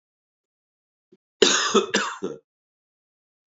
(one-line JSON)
{"cough_length": "3.6 s", "cough_amplitude": 28236, "cough_signal_mean_std_ratio": 0.32, "survey_phase": "beta (2021-08-13 to 2022-03-07)", "age": "45-64", "gender": "Male", "wearing_mask": "No", "symptom_cough_any": true, "symptom_runny_or_blocked_nose": true, "symptom_sore_throat": true, "symptom_headache": true, "symptom_other": true, "symptom_onset": "3 days", "smoker_status": "Never smoked", "respiratory_condition_asthma": false, "respiratory_condition_other": false, "recruitment_source": "Test and Trace", "submission_delay": "1 day", "covid_test_result": "Positive", "covid_test_method": "RT-qPCR", "covid_ct_value": 21.7, "covid_ct_gene": "N gene"}